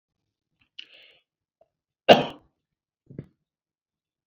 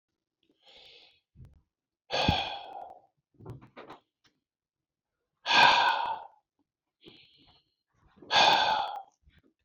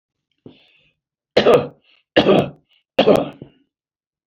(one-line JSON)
{"cough_length": "4.3 s", "cough_amplitude": 28525, "cough_signal_mean_std_ratio": 0.14, "exhalation_length": "9.6 s", "exhalation_amplitude": 16311, "exhalation_signal_mean_std_ratio": 0.34, "three_cough_length": "4.3 s", "three_cough_amplitude": 28263, "three_cough_signal_mean_std_ratio": 0.35, "survey_phase": "beta (2021-08-13 to 2022-03-07)", "age": "65+", "gender": "Male", "wearing_mask": "No", "symptom_shortness_of_breath": true, "smoker_status": "Ex-smoker", "respiratory_condition_asthma": false, "respiratory_condition_other": false, "recruitment_source": "REACT", "submission_delay": "2 days", "covid_test_result": "Negative", "covid_test_method": "RT-qPCR"}